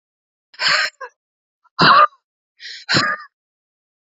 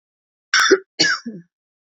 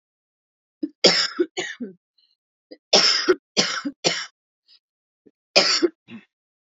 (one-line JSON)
{"exhalation_length": "4.0 s", "exhalation_amplitude": 28946, "exhalation_signal_mean_std_ratio": 0.37, "cough_length": "1.9 s", "cough_amplitude": 28899, "cough_signal_mean_std_ratio": 0.4, "three_cough_length": "6.7 s", "three_cough_amplitude": 31885, "three_cough_signal_mean_std_ratio": 0.37, "survey_phase": "beta (2021-08-13 to 2022-03-07)", "age": "45-64", "gender": "Female", "wearing_mask": "No", "symptom_cough_any": true, "symptom_onset": "2 days", "smoker_status": "Current smoker (11 or more cigarettes per day)", "respiratory_condition_asthma": false, "respiratory_condition_other": false, "recruitment_source": "Test and Trace", "submission_delay": "1 day", "covid_test_result": "Negative", "covid_test_method": "RT-qPCR"}